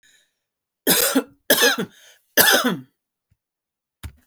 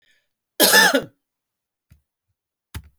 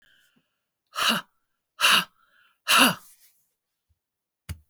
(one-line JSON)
{"three_cough_length": "4.3 s", "three_cough_amplitude": 32768, "three_cough_signal_mean_std_ratio": 0.4, "cough_length": "3.0 s", "cough_amplitude": 32768, "cough_signal_mean_std_ratio": 0.3, "exhalation_length": "4.7 s", "exhalation_amplitude": 23791, "exhalation_signal_mean_std_ratio": 0.31, "survey_phase": "beta (2021-08-13 to 2022-03-07)", "age": "45-64", "gender": "Female", "wearing_mask": "No", "symptom_headache": true, "smoker_status": "Never smoked", "respiratory_condition_asthma": false, "respiratory_condition_other": false, "recruitment_source": "REACT", "submission_delay": "4 days", "covid_test_result": "Negative", "covid_test_method": "RT-qPCR"}